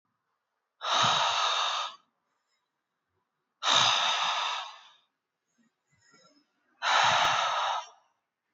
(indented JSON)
{
  "exhalation_length": "8.5 s",
  "exhalation_amplitude": 12078,
  "exhalation_signal_mean_std_ratio": 0.51,
  "survey_phase": "beta (2021-08-13 to 2022-03-07)",
  "age": "18-44",
  "gender": "Female",
  "wearing_mask": "No",
  "symptom_runny_or_blocked_nose": true,
  "symptom_fever_high_temperature": true,
  "symptom_headache": true,
  "smoker_status": "Current smoker (1 to 10 cigarettes per day)",
  "respiratory_condition_asthma": false,
  "respiratory_condition_other": false,
  "recruitment_source": "Test and Trace",
  "submission_delay": "2 days",
  "covid_test_result": "Positive",
  "covid_test_method": "ePCR"
}